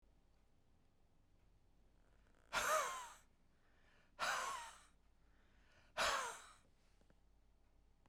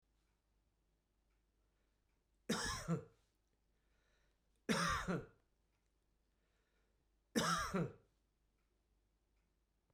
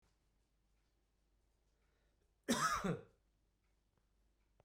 {"exhalation_length": "8.1 s", "exhalation_amplitude": 1800, "exhalation_signal_mean_std_ratio": 0.38, "three_cough_length": "9.9 s", "three_cough_amplitude": 2393, "three_cough_signal_mean_std_ratio": 0.33, "cough_length": "4.6 s", "cough_amplitude": 2277, "cough_signal_mean_std_ratio": 0.28, "survey_phase": "beta (2021-08-13 to 2022-03-07)", "age": "45-64", "gender": "Male", "wearing_mask": "No", "symptom_none": true, "smoker_status": "Never smoked", "respiratory_condition_asthma": false, "respiratory_condition_other": false, "recruitment_source": "REACT", "submission_delay": "1 day", "covid_test_result": "Negative", "covid_test_method": "RT-qPCR", "influenza_a_test_result": "Negative", "influenza_b_test_result": "Negative"}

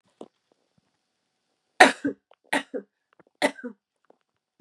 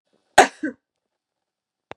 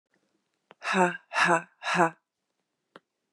{"three_cough_length": "4.6 s", "three_cough_amplitude": 32767, "three_cough_signal_mean_std_ratio": 0.19, "cough_length": "2.0 s", "cough_amplitude": 32768, "cough_signal_mean_std_ratio": 0.18, "exhalation_length": "3.3 s", "exhalation_amplitude": 15704, "exhalation_signal_mean_std_ratio": 0.37, "survey_phase": "beta (2021-08-13 to 2022-03-07)", "age": "18-44", "gender": "Female", "wearing_mask": "No", "symptom_cough_any": true, "symptom_runny_or_blocked_nose": true, "symptom_sore_throat": true, "symptom_fatigue": true, "symptom_headache": true, "symptom_change_to_sense_of_smell_or_taste": true, "symptom_loss_of_taste": true, "smoker_status": "Ex-smoker", "respiratory_condition_asthma": false, "respiratory_condition_other": false, "recruitment_source": "Test and Trace", "submission_delay": "1 day", "covid_test_result": "Positive", "covid_test_method": "RT-qPCR", "covid_ct_value": 24.4, "covid_ct_gene": "N gene"}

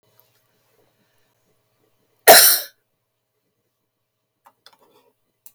{"cough_length": "5.5 s", "cough_amplitude": 32768, "cough_signal_mean_std_ratio": 0.19, "survey_phase": "beta (2021-08-13 to 2022-03-07)", "age": "65+", "gender": "Female", "wearing_mask": "No", "symptom_cough_any": true, "symptom_runny_or_blocked_nose": true, "symptom_headache": true, "symptom_onset": "12 days", "smoker_status": "Never smoked", "respiratory_condition_asthma": false, "respiratory_condition_other": false, "recruitment_source": "REACT", "submission_delay": "2 days", "covid_test_result": "Negative", "covid_test_method": "RT-qPCR"}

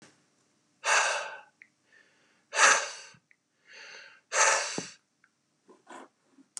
{"exhalation_length": "6.6 s", "exhalation_amplitude": 15291, "exhalation_signal_mean_std_ratio": 0.34, "survey_phase": "beta (2021-08-13 to 2022-03-07)", "age": "45-64", "gender": "Male", "wearing_mask": "No", "symptom_none": true, "smoker_status": "Never smoked", "respiratory_condition_asthma": false, "respiratory_condition_other": false, "recruitment_source": "REACT", "submission_delay": "3 days", "covid_test_result": "Negative", "covid_test_method": "RT-qPCR", "influenza_a_test_result": "Negative", "influenza_b_test_result": "Negative"}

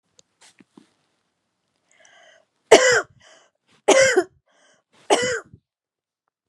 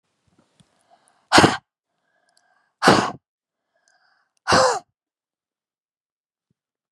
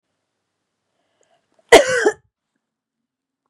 {"three_cough_length": "6.5 s", "three_cough_amplitude": 32768, "three_cough_signal_mean_std_ratio": 0.28, "exhalation_length": "6.9 s", "exhalation_amplitude": 32767, "exhalation_signal_mean_std_ratio": 0.25, "cough_length": "3.5 s", "cough_amplitude": 32768, "cough_signal_mean_std_ratio": 0.22, "survey_phase": "beta (2021-08-13 to 2022-03-07)", "age": "45-64", "gender": "Female", "wearing_mask": "No", "symptom_runny_or_blocked_nose": true, "symptom_shortness_of_breath": true, "symptom_abdominal_pain": true, "symptom_fatigue": true, "symptom_headache": true, "symptom_change_to_sense_of_smell_or_taste": true, "symptom_onset": "4 days", "smoker_status": "Never smoked", "respiratory_condition_asthma": false, "respiratory_condition_other": false, "recruitment_source": "Test and Trace", "submission_delay": "0 days", "covid_test_result": "Negative", "covid_test_method": "RT-qPCR"}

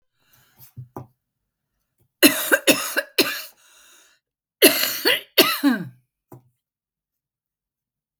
{"cough_length": "8.2 s", "cough_amplitude": 32768, "cough_signal_mean_std_ratio": 0.32, "survey_phase": "beta (2021-08-13 to 2022-03-07)", "age": "65+", "gender": "Female", "wearing_mask": "No", "symptom_none": true, "symptom_onset": "4 days", "smoker_status": "Never smoked", "respiratory_condition_asthma": false, "respiratory_condition_other": false, "recruitment_source": "REACT", "submission_delay": "5 days", "covid_test_result": "Negative", "covid_test_method": "RT-qPCR", "influenza_a_test_result": "Unknown/Void", "influenza_b_test_result": "Unknown/Void"}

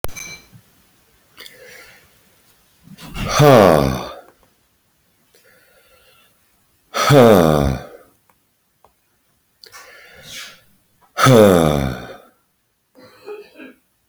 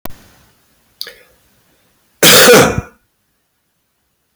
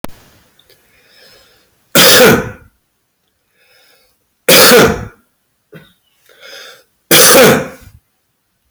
{"exhalation_length": "14.1 s", "exhalation_amplitude": 29754, "exhalation_signal_mean_std_ratio": 0.33, "cough_length": "4.4 s", "cough_amplitude": 32768, "cough_signal_mean_std_ratio": 0.34, "three_cough_length": "8.7 s", "three_cough_amplitude": 32768, "three_cough_signal_mean_std_ratio": 0.41, "survey_phase": "beta (2021-08-13 to 2022-03-07)", "age": "45-64", "gender": "Male", "wearing_mask": "No", "symptom_cough_any": true, "symptom_runny_or_blocked_nose": true, "symptom_sore_throat": true, "symptom_other": true, "smoker_status": "Ex-smoker", "respiratory_condition_asthma": false, "respiratory_condition_other": false, "recruitment_source": "Test and Trace", "submission_delay": "1 day", "covid_test_result": "Positive", "covid_test_method": "RT-qPCR", "covid_ct_value": 29.6, "covid_ct_gene": "ORF1ab gene", "covid_ct_mean": 30.4, "covid_viral_load": "100 copies/ml", "covid_viral_load_category": "Minimal viral load (< 10K copies/ml)"}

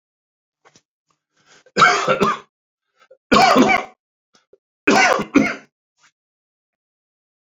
{"three_cough_length": "7.5 s", "three_cough_amplitude": 28255, "three_cough_signal_mean_std_ratio": 0.37, "survey_phase": "alpha (2021-03-01 to 2021-08-12)", "age": "45-64", "gender": "Male", "wearing_mask": "No", "symptom_new_continuous_cough": true, "symptom_fatigue": true, "symptom_headache": true, "smoker_status": "Never smoked", "respiratory_condition_asthma": false, "respiratory_condition_other": false, "recruitment_source": "Test and Trace", "submission_delay": "2 days", "covid_test_result": "Positive", "covid_test_method": "RT-qPCR", "covid_ct_value": 24.8, "covid_ct_gene": "ORF1ab gene", "covid_ct_mean": 25.0, "covid_viral_load": "6500 copies/ml", "covid_viral_load_category": "Minimal viral load (< 10K copies/ml)"}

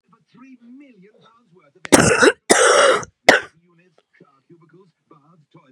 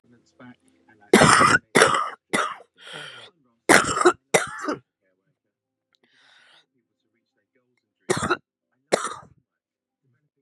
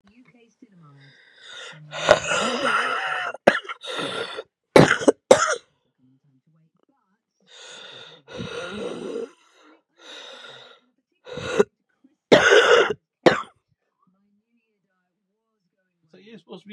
{"cough_length": "5.7 s", "cough_amplitude": 32768, "cough_signal_mean_std_ratio": 0.34, "three_cough_length": "10.4 s", "three_cough_amplitude": 32768, "three_cough_signal_mean_std_ratio": 0.32, "exhalation_length": "16.7 s", "exhalation_amplitude": 32768, "exhalation_signal_mean_std_ratio": 0.32, "survey_phase": "beta (2021-08-13 to 2022-03-07)", "age": "45-64", "gender": "Female", "wearing_mask": "No", "symptom_cough_any": true, "symptom_new_continuous_cough": true, "symptom_runny_or_blocked_nose": true, "symptom_shortness_of_breath": true, "symptom_sore_throat": true, "symptom_fatigue": true, "symptom_fever_high_temperature": true, "symptom_headache": true, "symptom_change_to_sense_of_smell_or_taste": true, "symptom_loss_of_taste": true, "symptom_onset": "2 days", "smoker_status": "Never smoked", "respiratory_condition_asthma": false, "respiratory_condition_other": false, "recruitment_source": "Test and Trace", "submission_delay": "2 days", "covid_test_result": "Positive", "covid_test_method": "RT-qPCR", "covid_ct_value": 18.0, "covid_ct_gene": "N gene"}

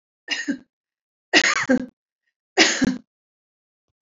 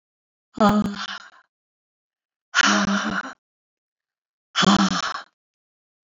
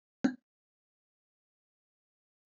{"three_cough_length": "4.0 s", "three_cough_amplitude": 27693, "three_cough_signal_mean_std_ratio": 0.37, "exhalation_length": "6.1 s", "exhalation_amplitude": 21449, "exhalation_signal_mean_std_ratio": 0.41, "cough_length": "2.5 s", "cough_amplitude": 5154, "cough_signal_mean_std_ratio": 0.13, "survey_phase": "beta (2021-08-13 to 2022-03-07)", "age": "65+", "gender": "Female", "wearing_mask": "No", "symptom_runny_or_blocked_nose": true, "smoker_status": "Never smoked", "respiratory_condition_asthma": false, "respiratory_condition_other": false, "recruitment_source": "REACT", "submission_delay": "0 days", "covid_test_result": "Negative", "covid_test_method": "RT-qPCR"}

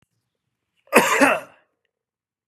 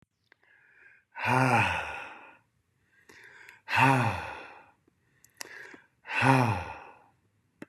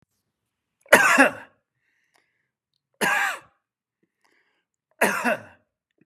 {"cough_length": "2.5 s", "cough_amplitude": 32108, "cough_signal_mean_std_ratio": 0.32, "exhalation_length": "7.7 s", "exhalation_amplitude": 14621, "exhalation_signal_mean_std_ratio": 0.4, "three_cough_length": "6.1 s", "three_cough_amplitude": 32767, "three_cough_signal_mean_std_ratio": 0.3, "survey_phase": "beta (2021-08-13 to 2022-03-07)", "age": "45-64", "gender": "Male", "wearing_mask": "No", "symptom_none": true, "smoker_status": "Never smoked", "respiratory_condition_asthma": false, "respiratory_condition_other": false, "recruitment_source": "REACT", "submission_delay": "1 day", "covid_test_result": "Negative", "covid_test_method": "RT-qPCR", "influenza_a_test_result": "Negative", "influenza_b_test_result": "Negative"}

